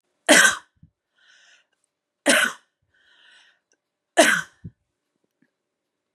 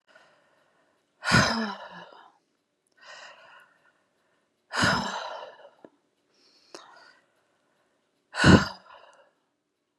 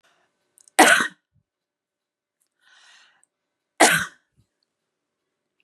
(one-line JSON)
{"three_cough_length": "6.1 s", "three_cough_amplitude": 32767, "three_cough_signal_mean_std_ratio": 0.27, "exhalation_length": "10.0 s", "exhalation_amplitude": 25071, "exhalation_signal_mean_std_ratio": 0.27, "cough_length": "5.6 s", "cough_amplitude": 32767, "cough_signal_mean_std_ratio": 0.23, "survey_phase": "beta (2021-08-13 to 2022-03-07)", "age": "45-64", "gender": "Female", "wearing_mask": "No", "symptom_none": true, "smoker_status": "Never smoked", "respiratory_condition_asthma": false, "respiratory_condition_other": false, "recruitment_source": "REACT", "submission_delay": "1 day", "covid_test_result": "Negative", "covid_test_method": "RT-qPCR", "influenza_a_test_result": "Negative", "influenza_b_test_result": "Negative"}